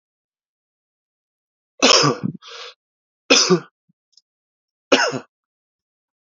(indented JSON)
{
  "three_cough_length": "6.4 s",
  "three_cough_amplitude": 32767,
  "three_cough_signal_mean_std_ratio": 0.29,
  "survey_phase": "beta (2021-08-13 to 2022-03-07)",
  "age": "45-64",
  "gender": "Male",
  "wearing_mask": "No",
  "symptom_cough_any": true,
  "symptom_runny_or_blocked_nose": true,
  "symptom_sore_throat": true,
  "symptom_change_to_sense_of_smell_or_taste": true,
  "symptom_onset": "6 days",
  "smoker_status": "Ex-smoker",
  "respiratory_condition_asthma": false,
  "respiratory_condition_other": false,
  "recruitment_source": "Test and Trace",
  "submission_delay": "1 day",
  "covid_test_result": "Positive",
  "covid_test_method": "ePCR"
}